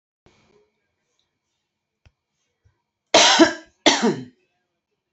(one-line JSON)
{"cough_length": "5.1 s", "cough_amplitude": 28140, "cough_signal_mean_std_ratio": 0.28, "survey_phase": "beta (2021-08-13 to 2022-03-07)", "age": "65+", "gender": "Female", "wearing_mask": "No", "symptom_none": true, "smoker_status": "Ex-smoker", "respiratory_condition_asthma": false, "respiratory_condition_other": false, "recruitment_source": "REACT", "submission_delay": "2 days", "covid_test_result": "Negative", "covid_test_method": "RT-qPCR", "influenza_a_test_result": "Negative", "influenza_b_test_result": "Negative"}